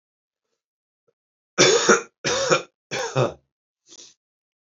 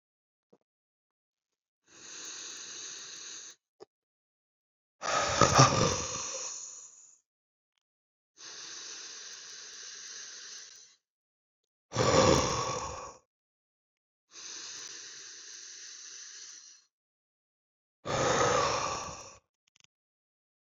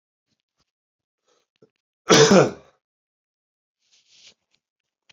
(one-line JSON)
{"three_cough_length": "4.7 s", "three_cough_amplitude": 26667, "three_cough_signal_mean_std_ratio": 0.36, "exhalation_length": "20.7 s", "exhalation_amplitude": 17845, "exhalation_signal_mean_std_ratio": 0.37, "cough_length": "5.1 s", "cough_amplitude": 28964, "cough_signal_mean_std_ratio": 0.22, "survey_phase": "beta (2021-08-13 to 2022-03-07)", "age": "18-44", "gender": "Male", "wearing_mask": "No", "symptom_cough_any": true, "symptom_runny_or_blocked_nose": true, "symptom_sore_throat": true, "symptom_fatigue": true, "symptom_headache": true, "symptom_change_to_sense_of_smell_or_taste": true, "symptom_loss_of_taste": true, "symptom_onset": "3 days", "smoker_status": "Never smoked", "respiratory_condition_asthma": false, "respiratory_condition_other": false, "recruitment_source": "Test and Trace", "submission_delay": "2 days", "covid_test_result": "Positive", "covid_test_method": "RT-qPCR", "covid_ct_value": 16.6, "covid_ct_gene": "ORF1ab gene", "covid_ct_mean": 17.1, "covid_viral_load": "2400000 copies/ml", "covid_viral_load_category": "High viral load (>1M copies/ml)"}